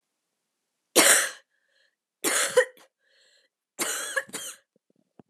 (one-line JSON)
{"three_cough_length": "5.3 s", "three_cough_amplitude": 26668, "three_cough_signal_mean_std_ratio": 0.33, "survey_phase": "beta (2021-08-13 to 2022-03-07)", "age": "18-44", "gender": "Female", "wearing_mask": "No", "symptom_cough_any": true, "symptom_runny_or_blocked_nose": true, "symptom_sore_throat": true, "symptom_fatigue": true, "smoker_status": "Never smoked", "respiratory_condition_asthma": false, "respiratory_condition_other": false, "recruitment_source": "Test and Trace", "submission_delay": "0 days", "covid_test_result": "Positive", "covid_test_method": "RT-qPCR", "covid_ct_value": 25.9, "covid_ct_gene": "ORF1ab gene"}